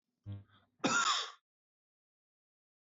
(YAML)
cough_length: 2.8 s
cough_amplitude: 4281
cough_signal_mean_std_ratio: 0.35
survey_phase: beta (2021-08-13 to 2022-03-07)
age: 45-64
gender: Male
wearing_mask: 'No'
symptom_none: true
smoker_status: Never smoked
respiratory_condition_asthma: false
respiratory_condition_other: false
recruitment_source: REACT
submission_delay: 3 days
covid_test_result: Negative
covid_test_method: RT-qPCR
influenza_a_test_result: Negative
influenza_b_test_result: Negative